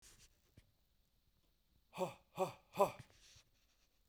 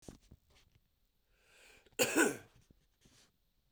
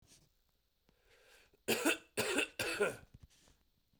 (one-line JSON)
{"exhalation_length": "4.1 s", "exhalation_amplitude": 4064, "exhalation_signal_mean_std_ratio": 0.24, "cough_length": "3.7 s", "cough_amplitude": 5106, "cough_signal_mean_std_ratio": 0.26, "three_cough_length": "4.0 s", "three_cough_amplitude": 3981, "three_cough_signal_mean_std_ratio": 0.4, "survey_phase": "beta (2021-08-13 to 2022-03-07)", "age": "45-64", "gender": "Male", "wearing_mask": "No", "symptom_cough_any": true, "symptom_runny_or_blocked_nose": true, "symptom_headache": true, "symptom_onset": "4 days", "smoker_status": "Ex-smoker", "respiratory_condition_asthma": false, "respiratory_condition_other": false, "recruitment_source": "REACT", "submission_delay": "3 days", "covid_test_result": "Negative", "covid_test_method": "RT-qPCR"}